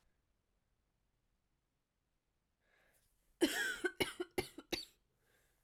{"cough_length": "5.6 s", "cough_amplitude": 3367, "cough_signal_mean_std_ratio": 0.28, "survey_phase": "beta (2021-08-13 to 2022-03-07)", "age": "18-44", "gender": "Female", "wearing_mask": "No", "symptom_cough_any": true, "symptom_runny_or_blocked_nose": true, "symptom_sore_throat": true, "symptom_fatigue": true, "symptom_headache": true, "symptom_change_to_sense_of_smell_or_taste": true, "symptom_loss_of_taste": true, "symptom_onset": "2 days", "smoker_status": "Never smoked", "respiratory_condition_asthma": false, "respiratory_condition_other": false, "recruitment_source": "Test and Trace", "submission_delay": "2 days", "covid_test_result": "Positive", "covid_test_method": "RT-qPCR", "covid_ct_value": 15.4, "covid_ct_gene": "ORF1ab gene", "covid_ct_mean": 15.9, "covid_viral_load": "5900000 copies/ml", "covid_viral_load_category": "High viral load (>1M copies/ml)"}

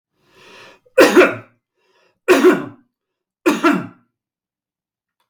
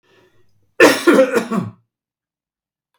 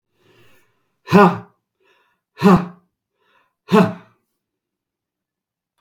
{"three_cough_length": "5.3 s", "three_cough_amplitude": 32768, "three_cough_signal_mean_std_ratio": 0.35, "cough_length": "3.0 s", "cough_amplitude": 32768, "cough_signal_mean_std_ratio": 0.37, "exhalation_length": "5.8 s", "exhalation_amplitude": 32768, "exhalation_signal_mean_std_ratio": 0.27, "survey_phase": "beta (2021-08-13 to 2022-03-07)", "age": "65+", "gender": "Male", "wearing_mask": "No", "symptom_runny_or_blocked_nose": true, "symptom_sore_throat": true, "symptom_onset": "6 days", "smoker_status": "Never smoked", "respiratory_condition_asthma": false, "respiratory_condition_other": false, "recruitment_source": "REACT", "submission_delay": "2 days", "covid_test_result": "Negative", "covid_test_method": "RT-qPCR", "influenza_a_test_result": "Negative", "influenza_b_test_result": "Negative"}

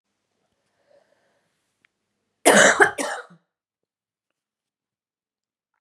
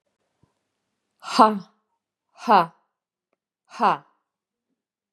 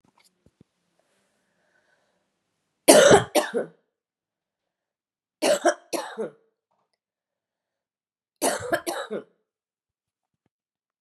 {"cough_length": "5.8 s", "cough_amplitude": 28283, "cough_signal_mean_std_ratio": 0.23, "exhalation_length": "5.1 s", "exhalation_amplitude": 27888, "exhalation_signal_mean_std_ratio": 0.24, "three_cough_length": "11.0 s", "three_cough_amplitude": 32345, "three_cough_signal_mean_std_ratio": 0.25, "survey_phase": "beta (2021-08-13 to 2022-03-07)", "age": "45-64", "gender": "Female", "wearing_mask": "No", "symptom_cough_any": true, "symptom_runny_or_blocked_nose": true, "symptom_sore_throat": true, "symptom_abdominal_pain": true, "symptom_headache": true, "symptom_other": true, "symptom_onset": "1 day", "smoker_status": "Ex-smoker", "respiratory_condition_asthma": false, "respiratory_condition_other": false, "recruitment_source": "Test and Trace", "submission_delay": "1 day", "covid_test_result": "Positive", "covid_test_method": "ePCR"}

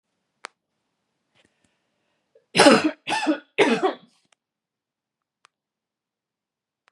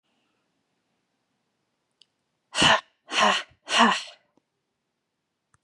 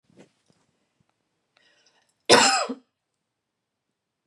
{"three_cough_length": "6.9 s", "three_cough_amplitude": 31359, "three_cough_signal_mean_std_ratio": 0.26, "exhalation_length": "5.6 s", "exhalation_amplitude": 19641, "exhalation_signal_mean_std_ratio": 0.3, "cough_length": "4.3 s", "cough_amplitude": 27245, "cough_signal_mean_std_ratio": 0.23, "survey_phase": "beta (2021-08-13 to 2022-03-07)", "age": "18-44", "gender": "Female", "wearing_mask": "No", "symptom_none": true, "smoker_status": "Never smoked", "respiratory_condition_asthma": false, "respiratory_condition_other": false, "recruitment_source": "REACT", "submission_delay": "1 day", "covid_test_result": "Negative", "covid_test_method": "RT-qPCR", "influenza_a_test_result": "Negative", "influenza_b_test_result": "Negative"}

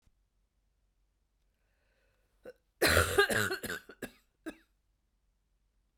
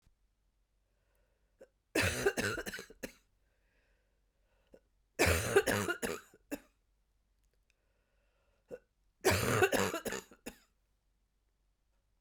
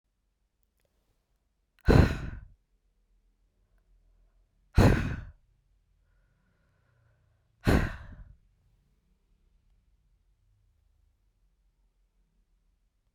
{"cough_length": "6.0 s", "cough_amplitude": 8764, "cough_signal_mean_std_ratio": 0.29, "three_cough_length": "12.2 s", "three_cough_amplitude": 7035, "three_cough_signal_mean_std_ratio": 0.34, "exhalation_length": "13.1 s", "exhalation_amplitude": 14760, "exhalation_signal_mean_std_ratio": 0.21, "survey_phase": "beta (2021-08-13 to 2022-03-07)", "age": "45-64", "gender": "Female", "wearing_mask": "No", "symptom_cough_any": true, "symptom_runny_or_blocked_nose": true, "symptom_fatigue": true, "symptom_headache": true, "symptom_onset": "2 days", "smoker_status": "Never smoked", "respiratory_condition_asthma": false, "respiratory_condition_other": false, "recruitment_source": "Test and Trace", "submission_delay": "1 day", "covid_test_result": "Positive", "covid_test_method": "RT-qPCR"}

